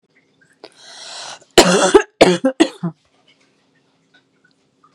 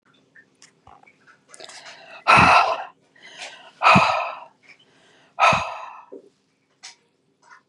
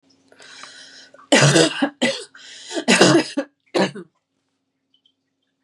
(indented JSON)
{
  "cough_length": "4.9 s",
  "cough_amplitude": 32768,
  "cough_signal_mean_std_ratio": 0.31,
  "exhalation_length": "7.7 s",
  "exhalation_amplitude": 28875,
  "exhalation_signal_mean_std_ratio": 0.34,
  "three_cough_length": "5.6 s",
  "three_cough_amplitude": 32767,
  "three_cough_signal_mean_std_ratio": 0.4,
  "survey_phase": "beta (2021-08-13 to 2022-03-07)",
  "age": "18-44",
  "gender": "Female",
  "wearing_mask": "No",
  "symptom_cough_any": true,
  "symptom_onset": "12 days",
  "smoker_status": "Never smoked",
  "respiratory_condition_asthma": false,
  "respiratory_condition_other": false,
  "recruitment_source": "REACT",
  "submission_delay": "1 day",
  "covid_test_result": "Negative",
  "covid_test_method": "RT-qPCR",
  "covid_ct_value": 38.9,
  "covid_ct_gene": "N gene",
  "influenza_a_test_result": "Negative",
  "influenza_b_test_result": "Negative"
}